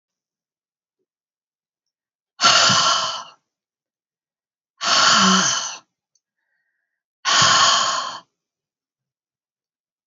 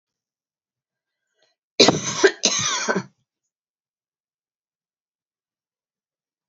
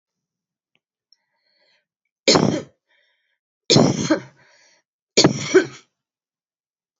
{"exhalation_length": "10.1 s", "exhalation_amplitude": 27815, "exhalation_signal_mean_std_ratio": 0.4, "cough_length": "6.5 s", "cough_amplitude": 30346, "cough_signal_mean_std_ratio": 0.26, "three_cough_length": "7.0 s", "three_cough_amplitude": 29755, "three_cough_signal_mean_std_ratio": 0.3, "survey_phase": "alpha (2021-03-01 to 2021-08-12)", "age": "65+", "gender": "Female", "wearing_mask": "No", "symptom_fatigue": true, "symptom_change_to_sense_of_smell_or_taste": true, "symptom_onset": "7 days", "smoker_status": "Never smoked", "respiratory_condition_asthma": false, "respiratory_condition_other": false, "recruitment_source": "Test and Trace", "submission_delay": "1 day", "covid_test_result": "Positive", "covid_test_method": "RT-qPCR"}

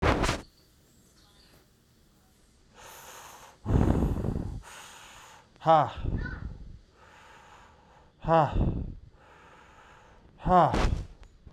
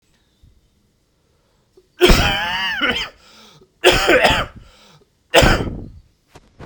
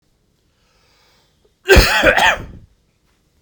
{"exhalation_length": "11.5 s", "exhalation_amplitude": 11857, "exhalation_signal_mean_std_ratio": 0.43, "three_cough_length": "6.7 s", "three_cough_amplitude": 32768, "three_cough_signal_mean_std_ratio": 0.43, "cough_length": "3.4 s", "cough_amplitude": 32768, "cough_signal_mean_std_ratio": 0.35, "survey_phase": "beta (2021-08-13 to 2022-03-07)", "age": "18-44", "gender": "Male", "wearing_mask": "No", "symptom_cough_any": true, "symptom_sore_throat": true, "smoker_status": "Ex-smoker", "respiratory_condition_asthma": false, "respiratory_condition_other": false, "recruitment_source": "Test and Trace", "submission_delay": "-1 day", "covid_test_result": "Negative", "covid_test_method": "LFT"}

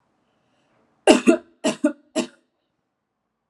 {"cough_length": "3.5 s", "cough_amplitude": 32767, "cough_signal_mean_std_ratio": 0.27, "survey_phase": "alpha (2021-03-01 to 2021-08-12)", "age": "18-44", "gender": "Female", "wearing_mask": "No", "symptom_none": true, "smoker_status": "Never smoked", "respiratory_condition_asthma": false, "respiratory_condition_other": false, "recruitment_source": "REACT", "submission_delay": "1 day", "covid_test_result": "Negative", "covid_test_method": "RT-qPCR"}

